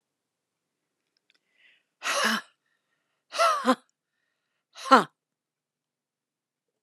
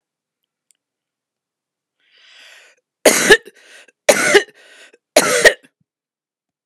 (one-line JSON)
{"exhalation_length": "6.8 s", "exhalation_amplitude": 27023, "exhalation_signal_mean_std_ratio": 0.25, "three_cough_length": "6.7 s", "three_cough_amplitude": 32768, "three_cough_signal_mean_std_ratio": 0.28, "survey_phase": "beta (2021-08-13 to 2022-03-07)", "age": "45-64", "gender": "Female", "wearing_mask": "No", "symptom_none": true, "smoker_status": "Never smoked", "respiratory_condition_asthma": false, "respiratory_condition_other": false, "recruitment_source": "REACT", "submission_delay": "4 days", "covid_test_result": "Negative", "covid_test_method": "RT-qPCR"}